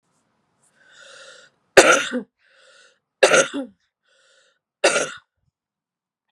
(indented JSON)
{
  "three_cough_length": "6.3 s",
  "three_cough_amplitude": 32768,
  "three_cough_signal_mean_std_ratio": 0.27,
  "survey_phase": "beta (2021-08-13 to 2022-03-07)",
  "age": "18-44",
  "gender": "Female",
  "wearing_mask": "No",
  "symptom_cough_any": true,
  "symptom_new_continuous_cough": true,
  "symptom_runny_or_blocked_nose": true,
  "symptom_shortness_of_breath": true,
  "symptom_headache": true,
  "symptom_onset": "3 days",
  "smoker_status": "Ex-smoker",
  "respiratory_condition_asthma": false,
  "respiratory_condition_other": false,
  "recruitment_source": "Test and Trace",
  "submission_delay": "2 days",
  "covid_test_result": "Positive",
  "covid_test_method": "RT-qPCR",
  "covid_ct_value": 31.0,
  "covid_ct_gene": "ORF1ab gene"
}